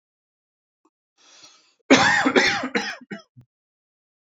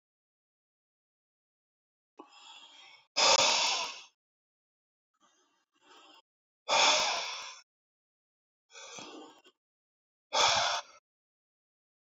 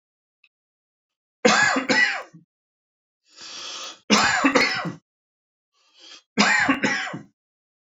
{
  "cough_length": "4.3 s",
  "cough_amplitude": 26511,
  "cough_signal_mean_std_ratio": 0.35,
  "exhalation_length": "12.1 s",
  "exhalation_amplitude": 9291,
  "exhalation_signal_mean_std_ratio": 0.32,
  "three_cough_length": "7.9 s",
  "three_cough_amplitude": 26671,
  "three_cough_signal_mean_std_ratio": 0.44,
  "survey_phase": "beta (2021-08-13 to 2022-03-07)",
  "age": "45-64",
  "gender": "Male",
  "wearing_mask": "No",
  "symptom_none": true,
  "smoker_status": "Never smoked",
  "respiratory_condition_asthma": true,
  "respiratory_condition_other": false,
  "recruitment_source": "REACT",
  "submission_delay": "1 day",
  "covid_test_result": "Negative",
  "covid_test_method": "RT-qPCR"
}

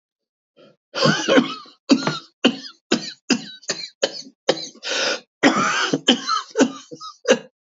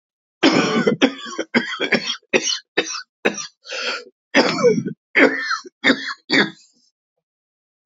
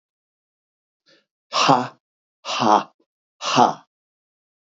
{
  "cough_length": "7.8 s",
  "cough_amplitude": 29016,
  "cough_signal_mean_std_ratio": 0.48,
  "three_cough_length": "7.9 s",
  "three_cough_amplitude": 28462,
  "three_cough_signal_mean_std_ratio": 0.5,
  "exhalation_length": "4.7 s",
  "exhalation_amplitude": 29047,
  "exhalation_signal_mean_std_ratio": 0.33,
  "survey_phase": "beta (2021-08-13 to 2022-03-07)",
  "age": "45-64",
  "gender": "Male",
  "wearing_mask": "No",
  "symptom_cough_any": true,
  "symptom_new_continuous_cough": true,
  "symptom_sore_throat": true,
  "symptom_fatigue": true,
  "symptom_headache": true,
  "symptom_onset": "3 days",
  "smoker_status": "Ex-smoker",
  "respiratory_condition_asthma": false,
  "respiratory_condition_other": false,
  "recruitment_source": "REACT",
  "submission_delay": "1 day",
  "covid_test_result": "Positive",
  "covid_test_method": "RT-qPCR",
  "covid_ct_value": 20.7,
  "covid_ct_gene": "E gene",
  "influenza_a_test_result": "Negative",
  "influenza_b_test_result": "Negative"
}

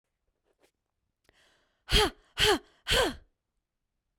{
  "exhalation_length": "4.2 s",
  "exhalation_amplitude": 10293,
  "exhalation_signal_mean_std_ratio": 0.32,
  "survey_phase": "beta (2021-08-13 to 2022-03-07)",
  "age": "18-44",
  "gender": "Female",
  "wearing_mask": "No",
  "symptom_none": true,
  "smoker_status": "Never smoked",
  "respiratory_condition_asthma": false,
  "respiratory_condition_other": false,
  "recruitment_source": "REACT",
  "submission_delay": "2 days",
  "covid_test_result": "Negative",
  "covid_test_method": "RT-qPCR"
}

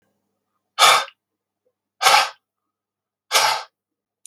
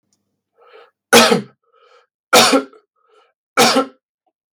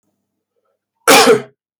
{
  "exhalation_length": "4.3 s",
  "exhalation_amplitude": 32767,
  "exhalation_signal_mean_std_ratio": 0.33,
  "three_cough_length": "4.5 s",
  "three_cough_amplitude": 32768,
  "three_cough_signal_mean_std_ratio": 0.36,
  "cough_length": "1.8 s",
  "cough_amplitude": 32768,
  "cough_signal_mean_std_ratio": 0.38,
  "survey_phase": "beta (2021-08-13 to 2022-03-07)",
  "age": "45-64",
  "gender": "Male",
  "wearing_mask": "No",
  "symptom_cough_any": true,
  "symptom_runny_or_blocked_nose": true,
  "symptom_fatigue": true,
  "symptom_headache": true,
  "smoker_status": "Never smoked",
  "respiratory_condition_asthma": false,
  "respiratory_condition_other": false,
  "recruitment_source": "REACT",
  "submission_delay": "32 days",
  "covid_test_result": "Negative",
  "covid_test_method": "RT-qPCR"
}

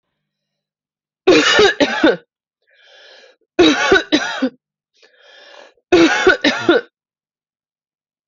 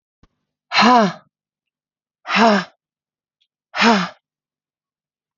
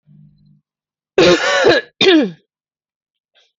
{
  "three_cough_length": "8.3 s",
  "three_cough_amplitude": 31003,
  "three_cough_signal_mean_std_ratio": 0.43,
  "exhalation_length": "5.4 s",
  "exhalation_amplitude": 31585,
  "exhalation_signal_mean_std_ratio": 0.35,
  "cough_length": "3.6 s",
  "cough_amplitude": 31387,
  "cough_signal_mean_std_ratio": 0.43,
  "survey_phase": "beta (2021-08-13 to 2022-03-07)",
  "age": "45-64",
  "gender": "Female",
  "wearing_mask": "No",
  "symptom_cough_any": true,
  "symptom_runny_or_blocked_nose": true,
  "symptom_headache": true,
  "symptom_onset": "4 days",
  "smoker_status": "Never smoked",
  "respiratory_condition_asthma": false,
  "respiratory_condition_other": false,
  "recruitment_source": "Test and Trace",
  "submission_delay": "3 days",
  "covid_test_result": "Positive",
  "covid_test_method": "ePCR"
}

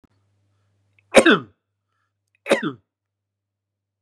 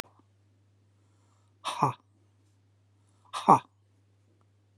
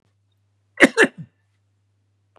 {
  "three_cough_length": "4.0 s",
  "three_cough_amplitude": 32768,
  "three_cough_signal_mean_std_ratio": 0.22,
  "exhalation_length": "4.8 s",
  "exhalation_amplitude": 20488,
  "exhalation_signal_mean_std_ratio": 0.19,
  "cough_length": "2.4 s",
  "cough_amplitude": 32768,
  "cough_signal_mean_std_ratio": 0.21,
  "survey_phase": "beta (2021-08-13 to 2022-03-07)",
  "age": "65+",
  "gender": "Male",
  "wearing_mask": "No",
  "symptom_sore_throat": true,
  "symptom_onset": "2 days",
  "smoker_status": "Ex-smoker",
  "respiratory_condition_asthma": false,
  "respiratory_condition_other": false,
  "recruitment_source": "REACT",
  "submission_delay": "2 days",
  "covid_test_result": "Negative",
  "covid_test_method": "RT-qPCR",
  "influenza_a_test_result": "Negative",
  "influenza_b_test_result": "Negative"
}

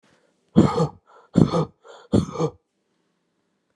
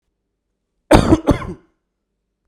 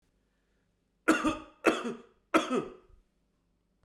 {
  "exhalation_length": "3.8 s",
  "exhalation_amplitude": 32531,
  "exhalation_signal_mean_std_ratio": 0.34,
  "cough_length": "2.5 s",
  "cough_amplitude": 32768,
  "cough_signal_mean_std_ratio": 0.3,
  "three_cough_length": "3.8 s",
  "three_cough_amplitude": 11074,
  "three_cough_signal_mean_std_ratio": 0.34,
  "survey_phase": "alpha (2021-03-01 to 2021-08-12)",
  "age": "45-64",
  "gender": "Male",
  "wearing_mask": "No",
  "symptom_cough_any": true,
  "symptom_fatigue": true,
  "symptom_fever_high_temperature": true,
  "symptom_headache": true,
  "symptom_change_to_sense_of_smell_or_taste": true,
  "smoker_status": "Never smoked",
  "respiratory_condition_asthma": false,
  "respiratory_condition_other": false,
  "recruitment_source": "Test and Trace",
  "submission_delay": "2 days",
  "covid_test_result": "Positive",
  "covid_test_method": "RT-qPCR",
  "covid_ct_value": 25.2,
  "covid_ct_gene": "ORF1ab gene"
}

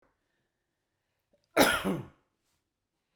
{
  "cough_length": "3.2 s",
  "cough_amplitude": 16141,
  "cough_signal_mean_std_ratio": 0.26,
  "survey_phase": "beta (2021-08-13 to 2022-03-07)",
  "age": "65+",
  "gender": "Male",
  "wearing_mask": "No",
  "symptom_none": true,
  "smoker_status": "Ex-smoker",
  "respiratory_condition_asthma": false,
  "respiratory_condition_other": false,
  "recruitment_source": "REACT",
  "submission_delay": "2 days",
  "covid_test_result": "Negative",
  "covid_test_method": "RT-qPCR"
}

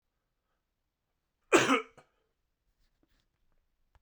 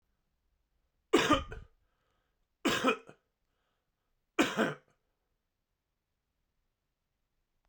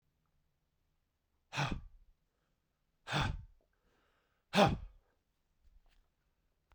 {
  "cough_length": "4.0 s",
  "cough_amplitude": 11615,
  "cough_signal_mean_std_ratio": 0.2,
  "three_cough_length": "7.7 s",
  "three_cough_amplitude": 8697,
  "three_cough_signal_mean_std_ratio": 0.27,
  "exhalation_length": "6.7 s",
  "exhalation_amplitude": 7127,
  "exhalation_signal_mean_std_ratio": 0.25,
  "survey_phase": "beta (2021-08-13 to 2022-03-07)",
  "age": "45-64",
  "gender": "Male",
  "wearing_mask": "No",
  "symptom_cough_any": true,
  "symptom_runny_or_blocked_nose": true,
  "symptom_fever_high_temperature": true,
  "symptom_headache": true,
  "smoker_status": "Never smoked",
  "respiratory_condition_asthma": false,
  "respiratory_condition_other": false,
  "recruitment_source": "Test and Trace",
  "submission_delay": "2 days",
  "covid_test_result": "Positive",
  "covid_test_method": "RT-qPCR",
  "covid_ct_value": 25.9,
  "covid_ct_gene": "ORF1ab gene"
}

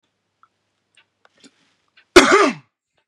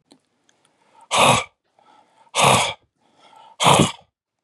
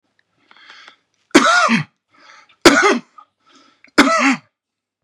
{
  "cough_length": "3.1 s",
  "cough_amplitude": 32768,
  "cough_signal_mean_std_ratio": 0.25,
  "exhalation_length": "4.4 s",
  "exhalation_amplitude": 31638,
  "exhalation_signal_mean_std_ratio": 0.38,
  "three_cough_length": "5.0 s",
  "three_cough_amplitude": 32768,
  "three_cough_signal_mean_std_ratio": 0.39,
  "survey_phase": "beta (2021-08-13 to 2022-03-07)",
  "age": "18-44",
  "gender": "Male",
  "wearing_mask": "No",
  "symptom_none": true,
  "smoker_status": "Never smoked",
  "respiratory_condition_asthma": true,
  "respiratory_condition_other": false,
  "recruitment_source": "REACT",
  "submission_delay": "1 day",
  "covid_test_result": "Negative",
  "covid_test_method": "RT-qPCR",
  "influenza_a_test_result": "Negative",
  "influenza_b_test_result": "Negative"
}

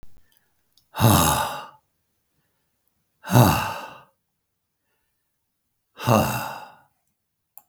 {
  "exhalation_length": "7.7 s",
  "exhalation_amplitude": 32766,
  "exhalation_signal_mean_std_ratio": 0.33,
  "survey_phase": "beta (2021-08-13 to 2022-03-07)",
  "age": "65+",
  "gender": "Male",
  "wearing_mask": "No",
  "symptom_none": true,
  "smoker_status": "Never smoked",
  "respiratory_condition_asthma": false,
  "respiratory_condition_other": false,
  "recruitment_source": "REACT",
  "submission_delay": "2 days",
  "covid_test_result": "Negative",
  "covid_test_method": "RT-qPCR",
  "influenza_a_test_result": "Negative",
  "influenza_b_test_result": "Negative"
}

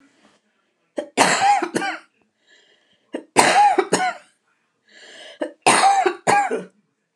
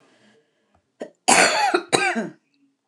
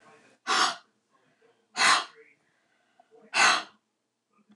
{
  "three_cough_length": "7.2 s",
  "three_cough_amplitude": 29204,
  "three_cough_signal_mean_std_ratio": 0.47,
  "cough_length": "2.9 s",
  "cough_amplitude": 29204,
  "cough_signal_mean_std_ratio": 0.43,
  "exhalation_length": "4.6 s",
  "exhalation_amplitude": 14445,
  "exhalation_signal_mean_std_ratio": 0.34,
  "survey_phase": "alpha (2021-03-01 to 2021-08-12)",
  "age": "65+",
  "gender": "Female",
  "wearing_mask": "No",
  "symptom_none": true,
  "smoker_status": "Never smoked",
  "respiratory_condition_asthma": false,
  "respiratory_condition_other": false,
  "recruitment_source": "REACT",
  "submission_delay": "5 days",
  "covid_test_result": "Negative",
  "covid_test_method": "RT-qPCR"
}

